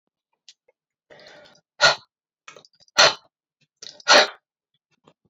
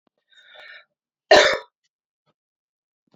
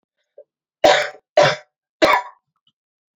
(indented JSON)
{
  "exhalation_length": "5.3 s",
  "exhalation_amplitude": 28544,
  "exhalation_signal_mean_std_ratio": 0.24,
  "cough_length": "3.2 s",
  "cough_amplitude": 28538,
  "cough_signal_mean_std_ratio": 0.22,
  "three_cough_length": "3.2 s",
  "three_cough_amplitude": 28854,
  "three_cough_signal_mean_std_ratio": 0.35,
  "survey_phase": "alpha (2021-03-01 to 2021-08-12)",
  "age": "45-64",
  "gender": "Female",
  "wearing_mask": "No",
  "symptom_new_continuous_cough": true,
  "symptom_fatigue": true,
  "symptom_headache": true,
  "symptom_change_to_sense_of_smell_or_taste": true,
  "symptom_loss_of_taste": true,
  "symptom_onset": "4 days",
  "smoker_status": "Never smoked",
  "respiratory_condition_asthma": false,
  "respiratory_condition_other": false,
  "recruitment_source": "Test and Trace",
  "submission_delay": "2 days",
  "covid_test_result": "Positive",
  "covid_test_method": "RT-qPCR"
}